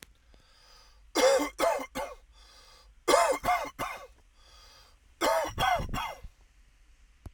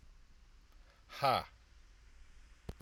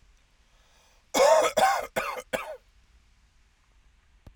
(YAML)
three_cough_length: 7.3 s
three_cough_amplitude: 12614
three_cough_signal_mean_std_ratio: 0.47
exhalation_length: 2.8 s
exhalation_amplitude: 4588
exhalation_signal_mean_std_ratio: 0.33
cough_length: 4.4 s
cough_amplitude: 11734
cough_signal_mean_std_ratio: 0.37
survey_phase: alpha (2021-03-01 to 2021-08-12)
age: 18-44
gender: Male
wearing_mask: 'No'
symptom_none: true
smoker_status: Ex-smoker
respiratory_condition_asthma: false
respiratory_condition_other: false
recruitment_source: REACT
submission_delay: 1 day
covid_test_result: Negative
covid_test_method: RT-qPCR